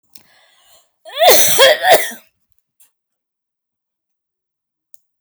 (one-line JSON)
{"cough_length": "5.2 s", "cough_amplitude": 32768, "cough_signal_mean_std_ratio": 0.34, "survey_phase": "alpha (2021-03-01 to 2021-08-12)", "age": "45-64", "gender": "Female", "wearing_mask": "No", "symptom_none": true, "smoker_status": "Never smoked", "respiratory_condition_asthma": false, "respiratory_condition_other": false, "recruitment_source": "REACT", "submission_delay": "2 days", "covid_test_result": "Negative", "covid_test_method": "RT-qPCR"}